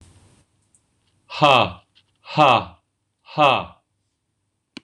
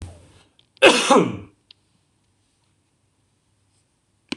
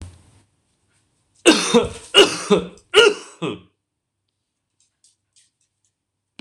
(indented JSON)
{
  "exhalation_length": "4.8 s",
  "exhalation_amplitude": 26028,
  "exhalation_signal_mean_std_ratio": 0.32,
  "cough_length": "4.4 s",
  "cough_amplitude": 26028,
  "cough_signal_mean_std_ratio": 0.26,
  "three_cough_length": "6.4 s",
  "three_cough_amplitude": 26028,
  "three_cough_signal_mean_std_ratio": 0.3,
  "survey_phase": "beta (2021-08-13 to 2022-03-07)",
  "age": "65+",
  "gender": "Male",
  "wearing_mask": "No",
  "symptom_cough_any": true,
  "symptom_runny_or_blocked_nose": true,
  "symptom_abdominal_pain": true,
  "symptom_fatigue": true,
  "symptom_headache": true,
  "symptom_onset": "3 days",
  "smoker_status": "Never smoked",
  "respiratory_condition_asthma": false,
  "respiratory_condition_other": false,
  "recruitment_source": "Test and Trace",
  "submission_delay": "2 days",
  "covid_test_result": "Positive",
  "covid_test_method": "RT-qPCR",
  "covid_ct_value": 18.3,
  "covid_ct_gene": "ORF1ab gene",
  "covid_ct_mean": 19.4,
  "covid_viral_load": "450000 copies/ml",
  "covid_viral_load_category": "Low viral load (10K-1M copies/ml)"
}